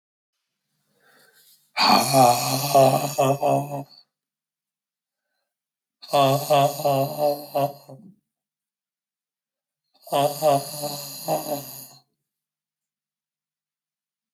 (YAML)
exhalation_length: 14.3 s
exhalation_amplitude: 21153
exhalation_signal_mean_std_ratio: 0.43
survey_phase: beta (2021-08-13 to 2022-03-07)
age: 45-64
gender: Male
wearing_mask: 'No'
symptom_cough_any: true
symptom_new_continuous_cough: true
symptom_shortness_of_breath: true
symptom_sore_throat: true
symptom_fatigue: true
symptom_headache: true
smoker_status: Never smoked
respiratory_condition_asthma: true
respiratory_condition_other: true
recruitment_source: Test and Trace
submission_delay: 0 days
covid_test_result: Positive
covid_test_method: LFT